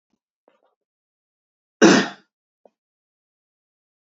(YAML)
cough_length: 4.1 s
cough_amplitude: 27787
cough_signal_mean_std_ratio: 0.19
survey_phase: beta (2021-08-13 to 2022-03-07)
age: 18-44
gender: Male
wearing_mask: 'No'
symptom_runny_or_blocked_nose: true
symptom_headache: true
symptom_change_to_sense_of_smell_or_taste: true
symptom_onset: 3 days
smoker_status: Never smoked
respiratory_condition_asthma: false
respiratory_condition_other: false
recruitment_source: Test and Trace
submission_delay: 2 days
covid_test_result: Positive
covid_test_method: RT-qPCR